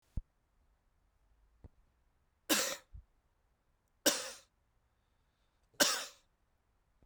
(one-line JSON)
{"three_cough_length": "7.1 s", "three_cough_amplitude": 8698, "three_cough_signal_mean_std_ratio": 0.25, "survey_phase": "beta (2021-08-13 to 2022-03-07)", "age": "45-64", "gender": "Male", "wearing_mask": "No", "symptom_headache": true, "symptom_change_to_sense_of_smell_or_taste": true, "symptom_onset": "5 days", "smoker_status": "Prefer not to say", "respiratory_condition_asthma": false, "respiratory_condition_other": true, "recruitment_source": "Test and Trace", "submission_delay": "2 days", "covid_test_result": "Positive", "covid_test_method": "RT-qPCR"}